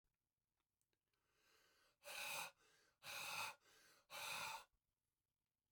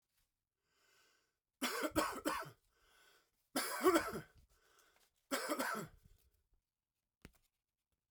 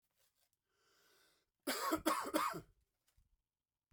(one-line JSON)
{"exhalation_length": "5.7 s", "exhalation_amplitude": 550, "exhalation_signal_mean_std_ratio": 0.45, "three_cough_length": "8.1 s", "three_cough_amplitude": 3945, "three_cough_signal_mean_std_ratio": 0.36, "cough_length": "3.9 s", "cough_amplitude": 3390, "cough_signal_mean_std_ratio": 0.37, "survey_phase": "beta (2021-08-13 to 2022-03-07)", "age": "45-64", "gender": "Male", "wearing_mask": "No", "symptom_cough_any": true, "symptom_runny_or_blocked_nose": true, "symptom_headache": true, "symptom_onset": "2 days", "smoker_status": "Never smoked", "respiratory_condition_asthma": false, "respiratory_condition_other": false, "recruitment_source": "Test and Trace", "submission_delay": "2 days", "covid_test_result": "Positive", "covid_test_method": "RT-qPCR", "covid_ct_value": 15.2, "covid_ct_gene": "ORF1ab gene", "covid_ct_mean": 15.4, "covid_viral_load": "9000000 copies/ml", "covid_viral_load_category": "High viral load (>1M copies/ml)"}